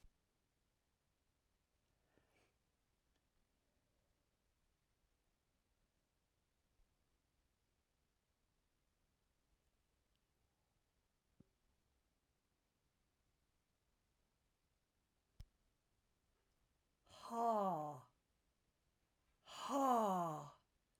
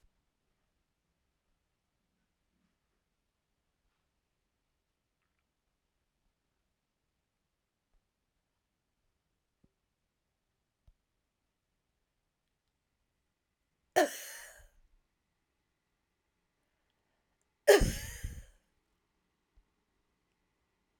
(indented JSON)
{
  "exhalation_length": "21.0 s",
  "exhalation_amplitude": 1935,
  "exhalation_signal_mean_std_ratio": 0.23,
  "cough_length": "21.0 s",
  "cough_amplitude": 11203,
  "cough_signal_mean_std_ratio": 0.12,
  "survey_phase": "alpha (2021-03-01 to 2021-08-12)",
  "age": "65+",
  "gender": "Female",
  "wearing_mask": "No",
  "symptom_none": true,
  "smoker_status": "Never smoked",
  "respiratory_condition_asthma": false,
  "respiratory_condition_other": false,
  "recruitment_source": "REACT",
  "submission_delay": "1 day",
  "covid_test_result": "Negative",
  "covid_test_method": "RT-qPCR"
}